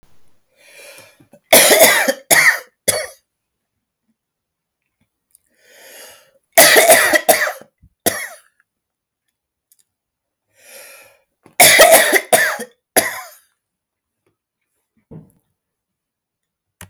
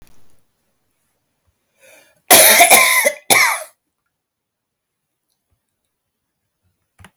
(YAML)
three_cough_length: 16.9 s
three_cough_amplitude: 32768
three_cough_signal_mean_std_ratio: 0.34
cough_length: 7.2 s
cough_amplitude: 32768
cough_signal_mean_std_ratio: 0.31
survey_phase: beta (2021-08-13 to 2022-03-07)
age: 45-64
gender: Female
wearing_mask: 'No'
symptom_none: true
smoker_status: Ex-smoker
respiratory_condition_asthma: false
respiratory_condition_other: false
recruitment_source: REACT
submission_delay: 2 days
covid_test_result: Negative
covid_test_method: RT-qPCR